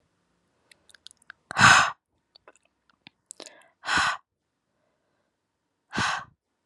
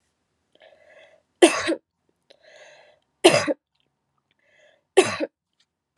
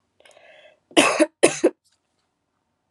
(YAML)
exhalation_length: 6.7 s
exhalation_amplitude: 23615
exhalation_signal_mean_std_ratio: 0.26
three_cough_length: 6.0 s
three_cough_amplitude: 31472
three_cough_signal_mean_std_ratio: 0.24
cough_length: 2.9 s
cough_amplitude: 32037
cough_signal_mean_std_ratio: 0.3
survey_phase: alpha (2021-03-01 to 2021-08-12)
age: 18-44
gender: Female
wearing_mask: 'No'
symptom_cough_any: true
symptom_change_to_sense_of_smell_or_taste: true
symptom_loss_of_taste: true
symptom_onset: 3 days
smoker_status: Never smoked
respiratory_condition_asthma: false
respiratory_condition_other: false
recruitment_source: Test and Trace
submission_delay: 2 days
covid_test_result: Positive
covid_test_method: RT-qPCR